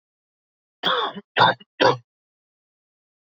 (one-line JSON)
{"three_cough_length": "3.2 s", "three_cough_amplitude": 25418, "three_cough_signal_mean_std_ratio": 0.32, "survey_phase": "beta (2021-08-13 to 2022-03-07)", "age": "18-44", "gender": "Male", "wearing_mask": "No", "symptom_cough_any": true, "symptom_new_continuous_cough": true, "symptom_runny_or_blocked_nose": true, "symptom_sore_throat": true, "symptom_fatigue": true, "symptom_change_to_sense_of_smell_or_taste": true, "symptom_onset": "2 days", "smoker_status": "Never smoked", "respiratory_condition_asthma": false, "respiratory_condition_other": false, "recruitment_source": "Test and Trace", "submission_delay": "1 day", "covid_test_result": "Positive", "covid_test_method": "RT-qPCR", "covid_ct_value": 24.2, "covid_ct_gene": "ORF1ab gene"}